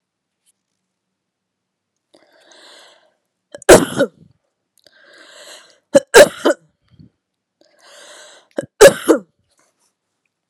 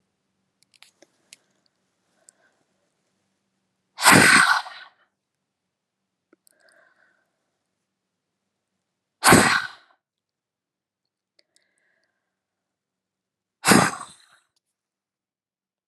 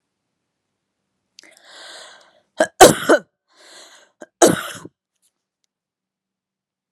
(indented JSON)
{
  "three_cough_length": "10.5 s",
  "three_cough_amplitude": 32768,
  "three_cough_signal_mean_std_ratio": 0.22,
  "exhalation_length": "15.9 s",
  "exhalation_amplitude": 31991,
  "exhalation_signal_mean_std_ratio": 0.22,
  "cough_length": "6.9 s",
  "cough_amplitude": 32768,
  "cough_signal_mean_std_ratio": 0.21,
  "survey_phase": "beta (2021-08-13 to 2022-03-07)",
  "age": "18-44",
  "gender": "Female",
  "wearing_mask": "No",
  "symptom_runny_or_blocked_nose": true,
  "symptom_shortness_of_breath": true,
  "symptom_sore_throat": true,
  "symptom_headache": true,
  "symptom_other": true,
  "smoker_status": "Never smoked",
  "respiratory_condition_asthma": false,
  "respiratory_condition_other": false,
  "recruitment_source": "Test and Trace",
  "submission_delay": "1 day",
  "covid_test_result": "Positive",
  "covid_test_method": "RT-qPCR",
  "covid_ct_value": 25.4,
  "covid_ct_gene": "ORF1ab gene",
  "covid_ct_mean": 26.4,
  "covid_viral_load": "2300 copies/ml",
  "covid_viral_load_category": "Minimal viral load (< 10K copies/ml)"
}